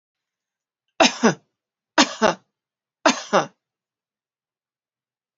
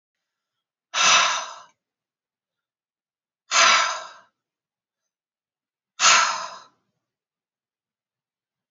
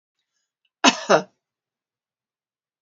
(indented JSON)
{
  "three_cough_length": "5.4 s",
  "three_cough_amplitude": 31438,
  "three_cough_signal_mean_std_ratio": 0.26,
  "exhalation_length": "8.7 s",
  "exhalation_amplitude": 26167,
  "exhalation_signal_mean_std_ratio": 0.31,
  "cough_length": "2.8 s",
  "cough_amplitude": 29506,
  "cough_signal_mean_std_ratio": 0.21,
  "survey_phase": "beta (2021-08-13 to 2022-03-07)",
  "age": "45-64",
  "gender": "Female",
  "wearing_mask": "No",
  "symptom_none": true,
  "smoker_status": "Ex-smoker",
  "respiratory_condition_asthma": true,
  "respiratory_condition_other": false,
  "recruitment_source": "REACT",
  "submission_delay": "1 day",
  "covid_test_result": "Negative",
  "covid_test_method": "RT-qPCR",
  "influenza_a_test_result": "Negative",
  "influenza_b_test_result": "Negative"
}